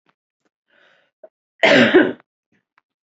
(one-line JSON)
{"cough_length": "3.2 s", "cough_amplitude": 28122, "cough_signal_mean_std_ratio": 0.31, "survey_phase": "alpha (2021-03-01 to 2021-08-12)", "age": "18-44", "gender": "Female", "wearing_mask": "No", "symptom_none": true, "smoker_status": "Never smoked", "respiratory_condition_asthma": false, "respiratory_condition_other": false, "recruitment_source": "REACT", "submission_delay": "1 day", "covid_test_result": "Negative", "covid_test_method": "RT-qPCR"}